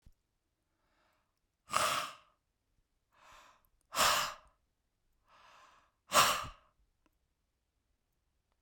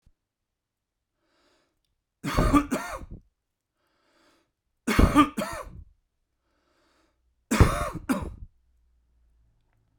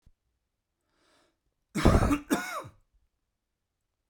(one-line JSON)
{"exhalation_length": "8.6 s", "exhalation_amplitude": 8953, "exhalation_signal_mean_std_ratio": 0.27, "three_cough_length": "10.0 s", "three_cough_amplitude": 22898, "three_cough_signal_mean_std_ratio": 0.3, "cough_length": "4.1 s", "cough_amplitude": 13519, "cough_signal_mean_std_ratio": 0.29, "survey_phase": "beta (2021-08-13 to 2022-03-07)", "age": "45-64", "gender": "Male", "wearing_mask": "No", "symptom_none": true, "smoker_status": "Ex-smoker", "respiratory_condition_asthma": false, "respiratory_condition_other": false, "recruitment_source": "REACT", "submission_delay": "2 days", "covid_test_result": "Negative", "covid_test_method": "RT-qPCR"}